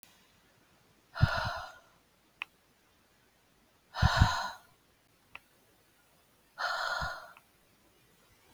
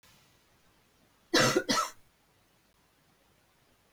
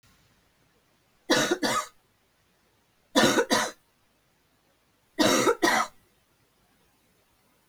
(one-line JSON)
{"exhalation_length": "8.5 s", "exhalation_amplitude": 11671, "exhalation_signal_mean_std_ratio": 0.31, "cough_length": "3.9 s", "cough_amplitude": 7502, "cough_signal_mean_std_ratio": 0.29, "three_cough_length": "7.7 s", "three_cough_amplitude": 13155, "three_cough_signal_mean_std_ratio": 0.37, "survey_phase": "beta (2021-08-13 to 2022-03-07)", "age": "45-64", "gender": "Female", "wearing_mask": "No", "symptom_none": true, "smoker_status": "Never smoked", "respiratory_condition_asthma": false, "respiratory_condition_other": false, "recruitment_source": "REACT", "submission_delay": "1 day", "covid_test_result": "Negative", "covid_test_method": "RT-qPCR", "influenza_a_test_result": "Negative", "influenza_b_test_result": "Negative"}